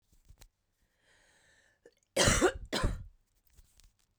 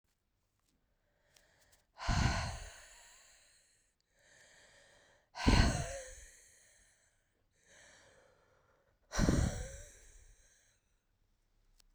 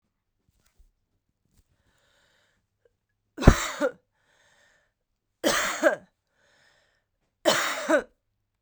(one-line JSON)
{"cough_length": "4.2 s", "cough_amplitude": 11588, "cough_signal_mean_std_ratio": 0.32, "exhalation_length": "11.9 s", "exhalation_amplitude": 6377, "exhalation_signal_mean_std_ratio": 0.3, "three_cough_length": "8.6 s", "three_cough_amplitude": 32767, "three_cough_signal_mean_std_ratio": 0.26, "survey_phase": "beta (2021-08-13 to 2022-03-07)", "age": "18-44", "gender": "Female", "wearing_mask": "No", "symptom_new_continuous_cough": true, "symptom_runny_or_blocked_nose": true, "symptom_abdominal_pain": true, "symptom_fatigue": true, "symptom_fever_high_temperature": true, "symptom_headache": true, "symptom_change_to_sense_of_smell_or_taste": true, "symptom_loss_of_taste": true, "symptom_onset": "2 days", "smoker_status": "Current smoker (1 to 10 cigarettes per day)", "respiratory_condition_asthma": false, "respiratory_condition_other": false, "recruitment_source": "Test and Trace", "submission_delay": "1 day", "covid_test_result": "Positive", "covid_test_method": "RT-qPCR", "covid_ct_value": 21.4, "covid_ct_gene": "ORF1ab gene"}